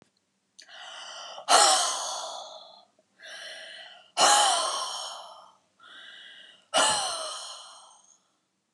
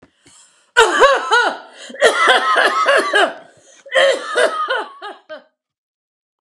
exhalation_length: 8.7 s
exhalation_amplitude: 16942
exhalation_signal_mean_std_ratio: 0.44
cough_length: 6.4 s
cough_amplitude: 32768
cough_signal_mean_std_ratio: 0.58
survey_phase: alpha (2021-03-01 to 2021-08-12)
age: 65+
gender: Female
wearing_mask: 'No'
symptom_none: true
smoker_status: Never smoked
respiratory_condition_asthma: false
respiratory_condition_other: false
recruitment_source: REACT
submission_delay: 2 days
covid_test_result: Negative
covid_test_method: RT-qPCR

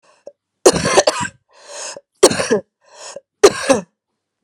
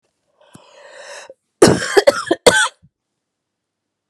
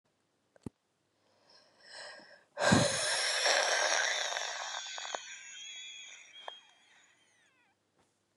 three_cough_length: 4.4 s
three_cough_amplitude: 32768
three_cough_signal_mean_std_ratio: 0.37
cough_length: 4.1 s
cough_amplitude: 32768
cough_signal_mean_std_ratio: 0.31
exhalation_length: 8.4 s
exhalation_amplitude: 8758
exhalation_signal_mean_std_ratio: 0.46
survey_phase: beta (2021-08-13 to 2022-03-07)
age: 18-44
gender: Female
wearing_mask: 'No'
symptom_cough_any: true
symptom_runny_or_blocked_nose: true
symptom_fatigue: true
symptom_fever_high_temperature: true
symptom_headache: true
symptom_change_to_sense_of_smell_or_taste: true
symptom_loss_of_taste: true
symptom_other: true
symptom_onset: 2 days
smoker_status: Never smoked
respiratory_condition_asthma: false
respiratory_condition_other: false
recruitment_source: Test and Trace
submission_delay: 2 days
covid_test_result: Positive
covid_test_method: RT-qPCR
covid_ct_value: 14.6
covid_ct_gene: ORF1ab gene
covid_ct_mean: 15.2
covid_viral_load: 10000000 copies/ml
covid_viral_load_category: High viral load (>1M copies/ml)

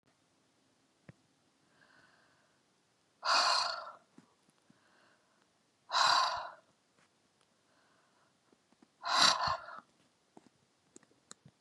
exhalation_length: 11.6 s
exhalation_amplitude: 9018
exhalation_signal_mean_std_ratio: 0.3
survey_phase: beta (2021-08-13 to 2022-03-07)
age: 45-64
gender: Female
wearing_mask: 'No'
symptom_cough_any: true
smoker_status: Current smoker (11 or more cigarettes per day)
respiratory_condition_asthma: false
respiratory_condition_other: false
recruitment_source: REACT
submission_delay: 1 day
covid_test_result: Negative
covid_test_method: RT-qPCR
influenza_a_test_result: Negative
influenza_b_test_result: Negative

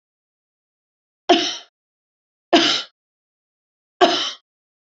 three_cough_length: 4.9 s
three_cough_amplitude: 31876
three_cough_signal_mean_std_ratio: 0.3
survey_phase: beta (2021-08-13 to 2022-03-07)
age: 65+
gender: Female
wearing_mask: 'No'
symptom_none: true
smoker_status: Never smoked
respiratory_condition_asthma: false
respiratory_condition_other: false
recruitment_source: REACT
submission_delay: 1 day
covid_test_result: Negative
covid_test_method: RT-qPCR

